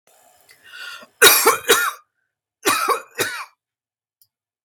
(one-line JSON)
{"cough_length": "4.6 s", "cough_amplitude": 32768, "cough_signal_mean_std_ratio": 0.37, "survey_phase": "beta (2021-08-13 to 2022-03-07)", "age": "45-64", "gender": "Female", "wearing_mask": "No", "symptom_none": true, "smoker_status": "Never smoked", "respiratory_condition_asthma": false, "respiratory_condition_other": false, "recruitment_source": "REACT", "submission_delay": "2 days", "covid_test_result": "Negative", "covid_test_method": "RT-qPCR"}